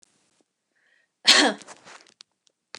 {"cough_length": "2.8 s", "cough_amplitude": 29541, "cough_signal_mean_std_ratio": 0.24, "survey_phase": "beta (2021-08-13 to 2022-03-07)", "age": "18-44", "gender": "Female", "wearing_mask": "No", "symptom_none": true, "smoker_status": "Never smoked", "respiratory_condition_asthma": false, "respiratory_condition_other": false, "recruitment_source": "REACT", "submission_delay": "1 day", "covid_test_result": "Negative", "covid_test_method": "RT-qPCR", "influenza_a_test_result": "Negative", "influenza_b_test_result": "Negative"}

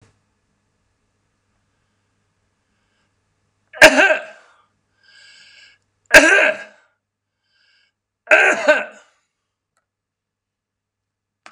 {"three_cough_length": "11.5 s", "three_cough_amplitude": 32768, "three_cough_signal_mean_std_ratio": 0.25, "survey_phase": "beta (2021-08-13 to 2022-03-07)", "age": "65+", "gender": "Male", "wearing_mask": "No", "symptom_none": true, "smoker_status": "Never smoked", "respiratory_condition_asthma": false, "respiratory_condition_other": false, "recruitment_source": "REACT", "submission_delay": "1 day", "covid_test_result": "Negative", "covid_test_method": "RT-qPCR", "influenza_a_test_result": "Negative", "influenza_b_test_result": "Negative"}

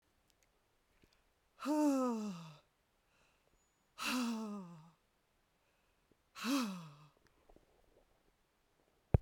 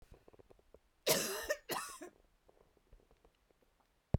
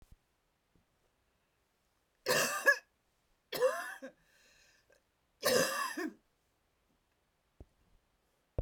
{"exhalation_length": "9.2 s", "exhalation_amplitude": 6633, "exhalation_signal_mean_std_ratio": 0.37, "cough_length": "4.2 s", "cough_amplitude": 5832, "cough_signal_mean_std_ratio": 0.31, "three_cough_length": "8.6 s", "three_cough_amplitude": 6789, "three_cough_signal_mean_std_ratio": 0.31, "survey_phase": "beta (2021-08-13 to 2022-03-07)", "age": "65+", "gender": "Female", "wearing_mask": "No", "symptom_cough_any": true, "smoker_status": "Never smoked", "respiratory_condition_asthma": false, "respiratory_condition_other": false, "recruitment_source": "REACT", "submission_delay": "3 days", "covid_test_result": "Negative", "covid_test_method": "RT-qPCR"}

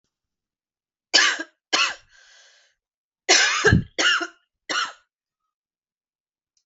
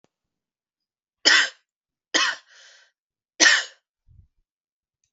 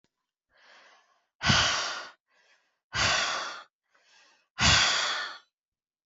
{"cough_length": "6.7 s", "cough_amplitude": 26295, "cough_signal_mean_std_ratio": 0.36, "three_cough_length": "5.1 s", "three_cough_amplitude": 29183, "three_cough_signal_mean_std_ratio": 0.27, "exhalation_length": "6.1 s", "exhalation_amplitude": 13835, "exhalation_signal_mean_std_ratio": 0.44, "survey_phase": "alpha (2021-03-01 to 2021-08-12)", "age": "18-44", "gender": "Female", "wearing_mask": "No", "symptom_cough_any": true, "symptom_fatigue": true, "symptom_fever_high_temperature": true, "symptom_headache": true, "symptom_change_to_sense_of_smell_or_taste": true, "symptom_onset": "3 days", "smoker_status": "Ex-smoker", "respiratory_condition_asthma": false, "respiratory_condition_other": false, "recruitment_source": "Test and Trace", "submission_delay": "2 days", "covid_test_result": "Positive", "covid_test_method": "RT-qPCR", "covid_ct_value": 25.7, "covid_ct_gene": "ORF1ab gene", "covid_ct_mean": 26.5, "covid_viral_load": "2100 copies/ml", "covid_viral_load_category": "Minimal viral load (< 10K copies/ml)"}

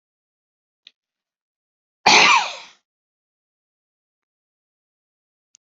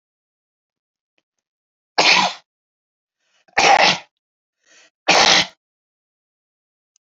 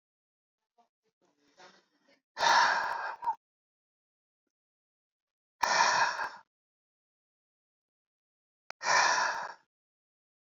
{"cough_length": "5.7 s", "cough_amplitude": 31113, "cough_signal_mean_std_ratio": 0.21, "three_cough_length": "7.1 s", "three_cough_amplitude": 30583, "three_cough_signal_mean_std_ratio": 0.31, "exhalation_length": "10.6 s", "exhalation_amplitude": 9869, "exhalation_signal_mean_std_ratio": 0.35, "survey_phase": "alpha (2021-03-01 to 2021-08-12)", "age": "65+", "gender": "Male", "wearing_mask": "No", "symptom_none": true, "smoker_status": "Never smoked", "respiratory_condition_asthma": false, "respiratory_condition_other": false, "recruitment_source": "REACT", "submission_delay": "3 days", "covid_test_result": "Negative", "covid_test_method": "RT-qPCR"}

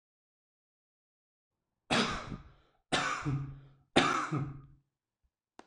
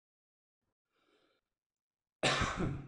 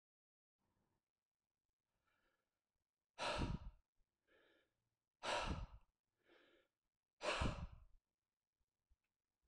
{"three_cough_length": "5.7 s", "three_cough_amplitude": 9203, "three_cough_signal_mean_std_ratio": 0.4, "cough_length": "2.9 s", "cough_amplitude": 4063, "cough_signal_mean_std_ratio": 0.35, "exhalation_length": "9.5 s", "exhalation_amplitude": 1197, "exhalation_signal_mean_std_ratio": 0.31, "survey_phase": "alpha (2021-03-01 to 2021-08-12)", "age": "18-44", "gender": "Male", "wearing_mask": "No", "symptom_none": true, "smoker_status": "Never smoked", "respiratory_condition_asthma": true, "respiratory_condition_other": true, "recruitment_source": "REACT", "submission_delay": "1 day", "covid_test_result": "Negative", "covid_test_method": "RT-qPCR"}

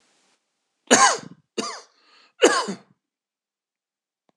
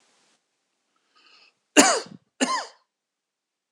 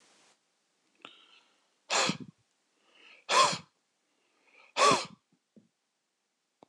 {"three_cough_length": "4.4 s", "three_cough_amplitude": 26028, "three_cough_signal_mean_std_ratio": 0.28, "cough_length": "3.7 s", "cough_amplitude": 26028, "cough_signal_mean_std_ratio": 0.25, "exhalation_length": "6.7 s", "exhalation_amplitude": 10869, "exhalation_signal_mean_std_ratio": 0.27, "survey_phase": "alpha (2021-03-01 to 2021-08-12)", "age": "65+", "gender": "Male", "wearing_mask": "No", "symptom_none": true, "smoker_status": "Ex-smoker", "respiratory_condition_asthma": false, "respiratory_condition_other": false, "recruitment_source": "REACT", "submission_delay": "1 day", "covid_test_result": "Negative", "covid_test_method": "RT-qPCR"}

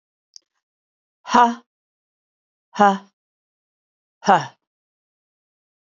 {"exhalation_length": "6.0 s", "exhalation_amplitude": 30613, "exhalation_signal_mean_std_ratio": 0.23, "survey_phase": "beta (2021-08-13 to 2022-03-07)", "age": "45-64", "gender": "Female", "wearing_mask": "No", "symptom_cough_any": true, "symptom_onset": "3 days", "smoker_status": "Never smoked", "respiratory_condition_asthma": true, "respiratory_condition_other": false, "recruitment_source": "Test and Trace", "submission_delay": "2 days", "covid_test_result": "Negative", "covid_test_method": "RT-qPCR"}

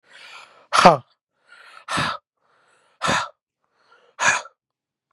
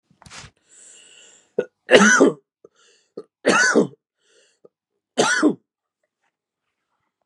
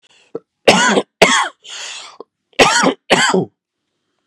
{"exhalation_length": "5.1 s", "exhalation_amplitude": 32768, "exhalation_signal_mean_std_ratio": 0.29, "three_cough_length": "7.3 s", "three_cough_amplitude": 32768, "three_cough_signal_mean_std_ratio": 0.33, "cough_length": "4.3 s", "cough_amplitude": 32768, "cough_signal_mean_std_ratio": 0.46, "survey_phase": "beta (2021-08-13 to 2022-03-07)", "age": "18-44", "gender": "Male", "wearing_mask": "No", "symptom_cough_any": true, "symptom_new_continuous_cough": true, "symptom_runny_or_blocked_nose": true, "symptom_sore_throat": true, "symptom_headache": true, "symptom_onset": "4 days", "smoker_status": "Never smoked", "respiratory_condition_asthma": false, "respiratory_condition_other": false, "recruitment_source": "Test and Trace", "submission_delay": "2 days", "covid_test_result": "Positive", "covid_test_method": "ePCR"}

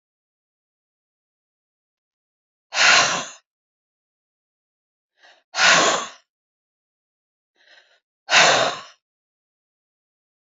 {"exhalation_length": "10.5 s", "exhalation_amplitude": 30088, "exhalation_signal_mean_std_ratio": 0.28, "survey_phase": "beta (2021-08-13 to 2022-03-07)", "age": "65+", "gender": "Female", "wearing_mask": "No", "symptom_cough_any": true, "symptom_onset": "12 days", "smoker_status": "Never smoked", "respiratory_condition_asthma": true, "respiratory_condition_other": false, "recruitment_source": "REACT", "submission_delay": "2 days", "covid_test_result": "Negative", "covid_test_method": "RT-qPCR", "influenza_a_test_result": "Unknown/Void", "influenza_b_test_result": "Unknown/Void"}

